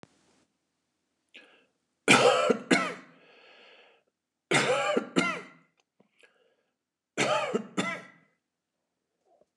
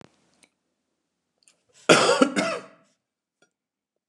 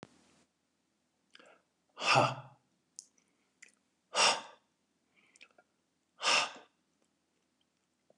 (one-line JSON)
{"three_cough_length": "9.6 s", "three_cough_amplitude": 16476, "three_cough_signal_mean_std_ratio": 0.36, "cough_length": "4.1 s", "cough_amplitude": 29204, "cough_signal_mean_std_ratio": 0.28, "exhalation_length": "8.2 s", "exhalation_amplitude": 7347, "exhalation_signal_mean_std_ratio": 0.26, "survey_phase": "beta (2021-08-13 to 2022-03-07)", "age": "45-64", "gender": "Male", "wearing_mask": "No", "symptom_runny_or_blocked_nose": true, "symptom_onset": "11 days", "smoker_status": "Never smoked", "respiratory_condition_asthma": false, "respiratory_condition_other": false, "recruitment_source": "REACT", "submission_delay": "1 day", "covid_test_result": "Negative", "covid_test_method": "RT-qPCR", "influenza_a_test_result": "Negative", "influenza_b_test_result": "Negative"}